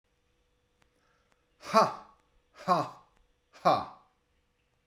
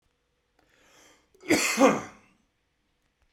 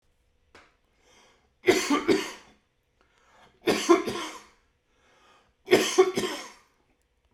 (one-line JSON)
{"exhalation_length": "4.9 s", "exhalation_amplitude": 13325, "exhalation_signal_mean_std_ratio": 0.27, "cough_length": "3.3 s", "cough_amplitude": 15388, "cough_signal_mean_std_ratio": 0.3, "three_cough_length": "7.3 s", "three_cough_amplitude": 17115, "three_cough_signal_mean_std_ratio": 0.35, "survey_phase": "beta (2021-08-13 to 2022-03-07)", "age": "45-64", "gender": "Male", "wearing_mask": "No", "symptom_cough_any": true, "symptom_fatigue": true, "symptom_headache": true, "smoker_status": "Never smoked", "respiratory_condition_asthma": false, "respiratory_condition_other": false, "recruitment_source": "Test and Trace", "submission_delay": "1 day", "covid_test_result": "Positive", "covid_test_method": "RT-qPCR", "covid_ct_value": 23.8, "covid_ct_gene": "ORF1ab gene", "covid_ct_mean": 24.4, "covid_viral_load": "9800 copies/ml", "covid_viral_load_category": "Minimal viral load (< 10K copies/ml)"}